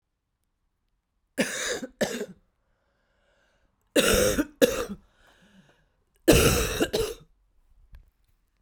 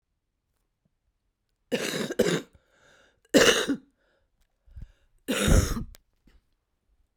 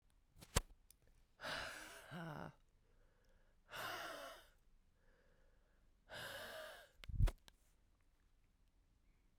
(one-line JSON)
{"three_cough_length": "8.6 s", "three_cough_amplitude": 21258, "three_cough_signal_mean_std_ratio": 0.37, "cough_length": "7.2 s", "cough_amplitude": 17987, "cough_signal_mean_std_ratio": 0.34, "exhalation_length": "9.4 s", "exhalation_amplitude": 4827, "exhalation_signal_mean_std_ratio": 0.34, "survey_phase": "beta (2021-08-13 to 2022-03-07)", "age": "45-64", "gender": "Female", "wearing_mask": "No", "symptom_new_continuous_cough": true, "symptom_shortness_of_breath": true, "symptom_fatigue": true, "symptom_headache": true, "symptom_change_to_sense_of_smell_or_taste": true, "symptom_loss_of_taste": true, "symptom_onset": "9 days", "smoker_status": "Current smoker (1 to 10 cigarettes per day)", "respiratory_condition_asthma": true, "respiratory_condition_other": false, "recruitment_source": "Test and Trace", "submission_delay": "7 days", "covid_test_result": "Positive", "covid_test_method": "RT-qPCR", "covid_ct_value": 17.7, "covid_ct_gene": "N gene", "covid_ct_mean": 18.3, "covid_viral_load": "980000 copies/ml", "covid_viral_load_category": "Low viral load (10K-1M copies/ml)"}